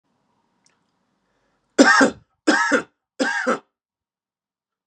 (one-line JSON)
{"three_cough_length": "4.9 s", "three_cough_amplitude": 32390, "three_cough_signal_mean_std_ratio": 0.34, "survey_phase": "beta (2021-08-13 to 2022-03-07)", "age": "18-44", "gender": "Male", "wearing_mask": "No", "symptom_none": true, "smoker_status": "Never smoked", "respiratory_condition_asthma": false, "respiratory_condition_other": false, "recruitment_source": "REACT", "submission_delay": "4 days", "covid_test_result": "Negative", "covid_test_method": "RT-qPCR", "influenza_a_test_result": "Negative", "influenza_b_test_result": "Negative"}